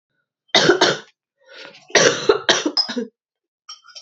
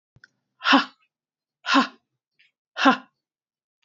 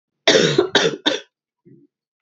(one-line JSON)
{"three_cough_length": "4.0 s", "three_cough_amplitude": 30409, "three_cough_signal_mean_std_ratio": 0.43, "exhalation_length": "3.8 s", "exhalation_amplitude": 25434, "exhalation_signal_mean_std_ratio": 0.29, "cough_length": "2.2 s", "cough_amplitude": 32631, "cough_signal_mean_std_ratio": 0.44, "survey_phase": "beta (2021-08-13 to 2022-03-07)", "age": "18-44", "gender": "Female", "wearing_mask": "No", "symptom_cough_any": true, "symptom_runny_or_blocked_nose": true, "symptom_sore_throat": true, "symptom_diarrhoea": true, "symptom_fatigue": true, "smoker_status": "Never smoked", "respiratory_condition_asthma": false, "respiratory_condition_other": false, "recruitment_source": "Test and Trace", "submission_delay": "2 days", "covid_test_result": "Positive", "covid_test_method": "RT-qPCR", "covid_ct_value": 21.1, "covid_ct_gene": "N gene", "covid_ct_mean": 21.9, "covid_viral_load": "67000 copies/ml", "covid_viral_load_category": "Low viral load (10K-1M copies/ml)"}